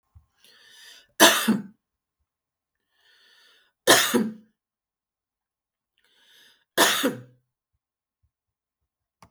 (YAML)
three_cough_length: 9.3 s
three_cough_amplitude: 32767
three_cough_signal_mean_std_ratio: 0.26
survey_phase: alpha (2021-03-01 to 2021-08-12)
age: 65+
gender: Female
wearing_mask: 'No'
symptom_none: true
symptom_onset: 12 days
smoker_status: Ex-smoker
respiratory_condition_asthma: false
respiratory_condition_other: false
recruitment_source: REACT
submission_delay: 1 day
covid_test_result: Negative
covid_test_method: RT-qPCR